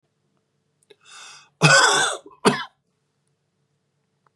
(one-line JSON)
{"cough_length": "4.4 s", "cough_amplitude": 31228, "cough_signal_mean_std_ratio": 0.31, "survey_phase": "beta (2021-08-13 to 2022-03-07)", "age": "45-64", "gender": "Male", "wearing_mask": "No", "symptom_diarrhoea": true, "symptom_headache": true, "symptom_change_to_sense_of_smell_or_taste": true, "smoker_status": "Never smoked", "respiratory_condition_asthma": true, "respiratory_condition_other": false, "recruitment_source": "Test and Trace", "submission_delay": "2 days", "covid_test_result": "Positive", "covid_test_method": "RT-qPCR", "covid_ct_value": 27.4, "covid_ct_gene": "ORF1ab gene", "covid_ct_mean": 28.4, "covid_viral_load": "470 copies/ml", "covid_viral_load_category": "Minimal viral load (< 10K copies/ml)"}